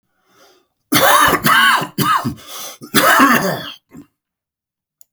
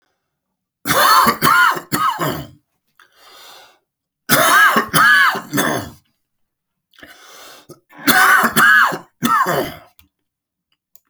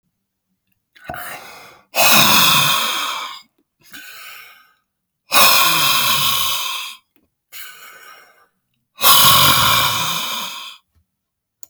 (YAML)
cough_length: 5.1 s
cough_amplitude: 32768
cough_signal_mean_std_ratio: 0.54
three_cough_length: 11.1 s
three_cough_amplitude: 32768
three_cough_signal_mean_std_ratio: 0.51
exhalation_length: 11.7 s
exhalation_amplitude: 32768
exhalation_signal_mean_std_ratio: 0.51
survey_phase: beta (2021-08-13 to 2022-03-07)
age: 45-64
gender: Male
wearing_mask: 'No'
symptom_new_continuous_cough: true
symptom_runny_or_blocked_nose: true
symptom_sore_throat: true
symptom_fatigue: true
symptom_fever_high_temperature: true
symptom_headache: true
symptom_onset: 7 days
smoker_status: Ex-smoker
respiratory_condition_asthma: false
respiratory_condition_other: false
recruitment_source: Test and Trace
submission_delay: 1 day
covid_test_result: Positive
covid_test_method: RT-qPCR
covid_ct_value: 20.2
covid_ct_gene: ORF1ab gene
covid_ct_mean: 20.4
covid_viral_load: 210000 copies/ml
covid_viral_load_category: Low viral load (10K-1M copies/ml)